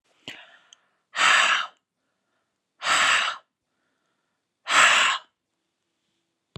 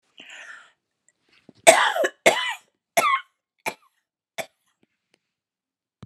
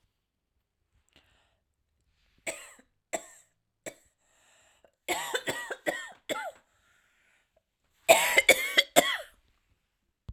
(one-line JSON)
{"exhalation_length": "6.6 s", "exhalation_amplitude": 19740, "exhalation_signal_mean_std_ratio": 0.39, "cough_length": "6.1 s", "cough_amplitude": 32768, "cough_signal_mean_std_ratio": 0.28, "three_cough_length": "10.3 s", "three_cough_amplitude": 22951, "three_cough_signal_mean_std_ratio": 0.26, "survey_phase": "alpha (2021-03-01 to 2021-08-12)", "age": "18-44", "gender": "Female", "wearing_mask": "No", "symptom_none": true, "smoker_status": "Never smoked", "respiratory_condition_asthma": false, "respiratory_condition_other": false, "recruitment_source": "REACT", "submission_delay": "1 day", "covid_test_result": "Negative", "covid_test_method": "RT-qPCR"}